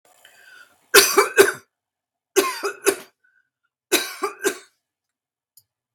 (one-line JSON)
{"three_cough_length": "5.9 s", "three_cough_amplitude": 32768, "three_cough_signal_mean_std_ratio": 0.31, "survey_phase": "beta (2021-08-13 to 2022-03-07)", "age": "45-64", "gender": "Female", "wearing_mask": "No", "symptom_none": true, "smoker_status": "Never smoked", "respiratory_condition_asthma": false, "respiratory_condition_other": false, "recruitment_source": "REACT", "submission_delay": "2 days", "covid_test_result": "Negative", "covid_test_method": "RT-qPCR"}